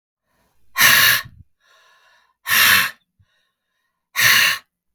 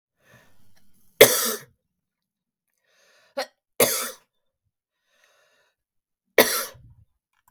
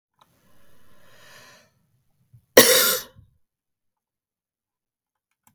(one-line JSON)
{"exhalation_length": "4.9 s", "exhalation_amplitude": 32768, "exhalation_signal_mean_std_ratio": 0.42, "three_cough_length": "7.5 s", "three_cough_amplitude": 32768, "three_cough_signal_mean_std_ratio": 0.22, "cough_length": "5.5 s", "cough_amplitude": 32768, "cough_signal_mean_std_ratio": 0.21, "survey_phase": "beta (2021-08-13 to 2022-03-07)", "age": "65+", "gender": "Female", "wearing_mask": "No", "symptom_none": true, "smoker_status": "Ex-smoker", "respiratory_condition_asthma": false, "respiratory_condition_other": false, "recruitment_source": "REACT", "submission_delay": "3 days", "covid_test_result": "Negative", "covid_test_method": "RT-qPCR"}